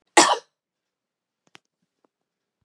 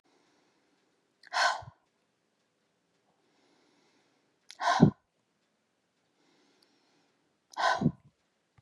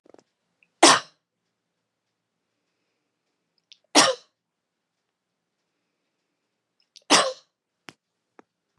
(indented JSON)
{
  "cough_length": "2.6 s",
  "cough_amplitude": 30739,
  "cough_signal_mean_std_ratio": 0.2,
  "exhalation_length": "8.6 s",
  "exhalation_amplitude": 17702,
  "exhalation_signal_mean_std_ratio": 0.23,
  "three_cough_length": "8.8 s",
  "three_cough_amplitude": 30792,
  "three_cough_signal_mean_std_ratio": 0.19,
  "survey_phase": "beta (2021-08-13 to 2022-03-07)",
  "age": "65+",
  "gender": "Female",
  "wearing_mask": "No",
  "symptom_none": true,
  "smoker_status": "Never smoked",
  "respiratory_condition_asthma": false,
  "respiratory_condition_other": false,
  "recruitment_source": "REACT",
  "submission_delay": "3 days",
  "covid_test_result": "Negative",
  "covid_test_method": "RT-qPCR",
  "influenza_a_test_result": "Negative",
  "influenza_b_test_result": "Negative"
}